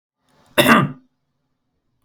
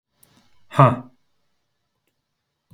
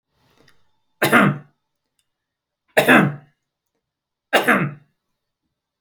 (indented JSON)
{
  "cough_length": "2.0 s",
  "cough_amplitude": 32141,
  "cough_signal_mean_std_ratio": 0.3,
  "exhalation_length": "2.7 s",
  "exhalation_amplitude": 28701,
  "exhalation_signal_mean_std_ratio": 0.2,
  "three_cough_length": "5.8 s",
  "three_cough_amplitude": 29435,
  "three_cough_signal_mean_std_ratio": 0.32,
  "survey_phase": "beta (2021-08-13 to 2022-03-07)",
  "age": "45-64",
  "gender": "Male",
  "wearing_mask": "No",
  "symptom_none": true,
  "smoker_status": "Never smoked",
  "respiratory_condition_asthma": false,
  "respiratory_condition_other": false,
  "recruitment_source": "REACT",
  "submission_delay": "2 days",
  "covid_test_result": "Negative",
  "covid_test_method": "RT-qPCR"
}